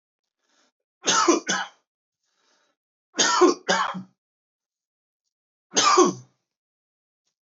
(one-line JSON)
{"three_cough_length": "7.4 s", "three_cough_amplitude": 19043, "three_cough_signal_mean_std_ratio": 0.35, "survey_phase": "beta (2021-08-13 to 2022-03-07)", "age": "18-44", "gender": "Male", "wearing_mask": "No", "symptom_none": true, "smoker_status": "Never smoked", "respiratory_condition_asthma": false, "respiratory_condition_other": false, "recruitment_source": "REACT", "submission_delay": "2 days", "covid_test_result": "Negative", "covid_test_method": "RT-qPCR", "influenza_a_test_result": "Negative", "influenza_b_test_result": "Negative"}